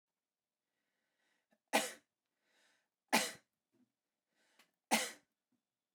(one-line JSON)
{"three_cough_length": "5.9 s", "three_cough_amplitude": 5094, "three_cough_signal_mean_std_ratio": 0.22, "survey_phase": "beta (2021-08-13 to 2022-03-07)", "age": "18-44", "gender": "Male", "wearing_mask": "No", "symptom_none": true, "smoker_status": "Never smoked", "respiratory_condition_asthma": false, "respiratory_condition_other": false, "recruitment_source": "REACT", "submission_delay": "3 days", "covid_test_result": "Negative", "covid_test_method": "RT-qPCR"}